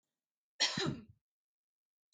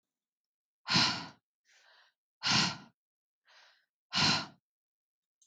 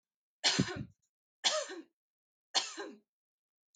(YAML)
cough_length: 2.1 s
cough_amplitude: 4624
cough_signal_mean_std_ratio: 0.31
exhalation_length: 5.5 s
exhalation_amplitude: 6378
exhalation_signal_mean_std_ratio: 0.34
three_cough_length: 3.8 s
three_cough_amplitude: 6500
three_cough_signal_mean_std_ratio: 0.35
survey_phase: beta (2021-08-13 to 2022-03-07)
age: 45-64
gender: Female
wearing_mask: 'No'
symptom_none: true
smoker_status: Ex-smoker
respiratory_condition_asthma: false
respiratory_condition_other: false
recruitment_source: REACT
submission_delay: 4 days
covid_test_result: Negative
covid_test_method: RT-qPCR
influenza_a_test_result: Negative
influenza_b_test_result: Negative